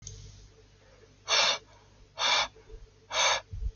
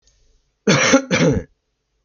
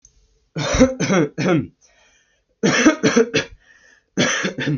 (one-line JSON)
{"exhalation_length": "3.8 s", "exhalation_amplitude": 8596, "exhalation_signal_mean_std_ratio": 0.48, "cough_length": "2.0 s", "cough_amplitude": 29519, "cough_signal_mean_std_ratio": 0.47, "three_cough_length": "4.8 s", "three_cough_amplitude": 27620, "three_cough_signal_mean_std_ratio": 0.54, "survey_phase": "alpha (2021-03-01 to 2021-08-12)", "age": "18-44", "gender": "Male", "wearing_mask": "No", "symptom_none": true, "smoker_status": "Never smoked", "respiratory_condition_asthma": false, "respiratory_condition_other": false, "recruitment_source": "REACT", "submission_delay": "6 days", "covid_test_result": "Negative", "covid_test_method": "RT-qPCR"}